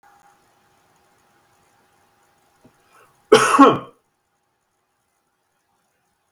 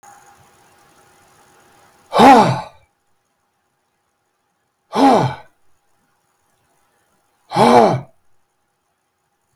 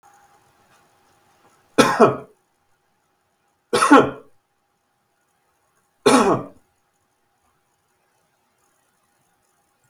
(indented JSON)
{
  "cough_length": "6.3 s",
  "cough_amplitude": 32768,
  "cough_signal_mean_std_ratio": 0.2,
  "exhalation_length": "9.6 s",
  "exhalation_amplitude": 32766,
  "exhalation_signal_mean_std_ratio": 0.29,
  "three_cough_length": "9.9 s",
  "three_cough_amplitude": 32767,
  "three_cough_signal_mean_std_ratio": 0.25,
  "survey_phase": "beta (2021-08-13 to 2022-03-07)",
  "age": "65+",
  "gender": "Male",
  "wearing_mask": "No",
  "symptom_none": true,
  "smoker_status": "Never smoked",
  "respiratory_condition_asthma": false,
  "respiratory_condition_other": false,
  "recruitment_source": "REACT",
  "submission_delay": "3 days",
  "covid_test_result": "Negative",
  "covid_test_method": "RT-qPCR",
  "influenza_a_test_result": "Negative",
  "influenza_b_test_result": "Negative"
}